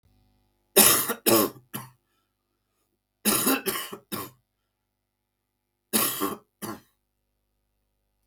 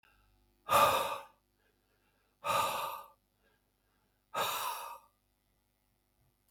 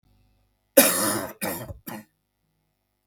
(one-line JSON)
{"three_cough_length": "8.3 s", "three_cough_amplitude": 26495, "three_cough_signal_mean_std_ratio": 0.33, "exhalation_length": "6.5 s", "exhalation_amplitude": 7731, "exhalation_signal_mean_std_ratio": 0.36, "cough_length": "3.1 s", "cough_amplitude": 32767, "cough_signal_mean_std_ratio": 0.33, "survey_phase": "beta (2021-08-13 to 2022-03-07)", "age": "45-64", "gender": "Male", "wearing_mask": "No", "symptom_cough_any": true, "symptom_new_continuous_cough": true, "symptom_sore_throat": true, "symptom_onset": "2 days", "smoker_status": "Never smoked", "respiratory_condition_asthma": false, "respiratory_condition_other": false, "recruitment_source": "REACT", "submission_delay": "1 day", "covid_test_result": "Positive", "covid_test_method": "RT-qPCR", "covid_ct_value": 16.7, "covid_ct_gene": "E gene", "influenza_a_test_result": "Negative", "influenza_b_test_result": "Negative"}